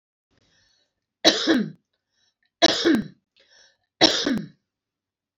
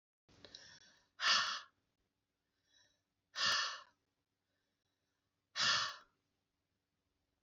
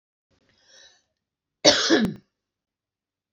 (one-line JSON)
{"three_cough_length": "5.4 s", "three_cough_amplitude": 28453, "three_cough_signal_mean_std_ratio": 0.35, "exhalation_length": "7.4 s", "exhalation_amplitude": 3684, "exhalation_signal_mean_std_ratio": 0.32, "cough_length": "3.3 s", "cough_amplitude": 29645, "cough_signal_mean_std_ratio": 0.28, "survey_phase": "alpha (2021-03-01 to 2021-08-12)", "age": "45-64", "gender": "Female", "wearing_mask": "No", "symptom_none": true, "smoker_status": "Current smoker (e-cigarettes or vapes only)", "respiratory_condition_asthma": false, "respiratory_condition_other": false, "recruitment_source": "REACT", "submission_delay": "2 days", "covid_test_result": "Negative", "covid_test_method": "RT-qPCR"}